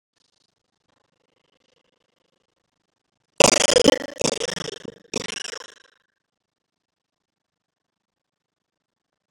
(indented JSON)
{
  "three_cough_length": "9.3 s",
  "three_cough_amplitude": 32768,
  "three_cough_signal_mean_std_ratio": 0.2,
  "survey_phase": "beta (2021-08-13 to 2022-03-07)",
  "age": "65+",
  "gender": "Female",
  "wearing_mask": "No",
  "symptom_cough_any": true,
  "symptom_new_continuous_cough": true,
  "symptom_runny_or_blocked_nose": true,
  "symptom_sore_throat": true,
  "symptom_fatigue": true,
  "symptom_fever_high_temperature": true,
  "symptom_headache": true,
  "symptom_other": true,
  "symptom_onset": "3 days",
  "smoker_status": "Never smoked",
  "respiratory_condition_asthma": false,
  "respiratory_condition_other": true,
  "recruitment_source": "Test and Trace",
  "submission_delay": "2 days",
  "covid_test_result": "Positive",
  "covid_test_method": "RT-qPCR",
  "covid_ct_value": 13.8,
  "covid_ct_gene": "N gene",
  "covid_ct_mean": 14.0,
  "covid_viral_load": "26000000 copies/ml",
  "covid_viral_load_category": "High viral load (>1M copies/ml)"
}